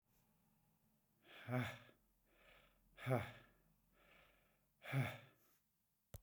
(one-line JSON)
{"exhalation_length": "6.2 s", "exhalation_amplitude": 1673, "exhalation_signal_mean_std_ratio": 0.32, "survey_phase": "beta (2021-08-13 to 2022-03-07)", "age": "65+", "gender": "Male", "wearing_mask": "No", "symptom_none": true, "smoker_status": "Ex-smoker", "respiratory_condition_asthma": false, "respiratory_condition_other": false, "recruitment_source": "REACT", "submission_delay": "5 days", "covid_test_result": "Negative", "covid_test_method": "RT-qPCR"}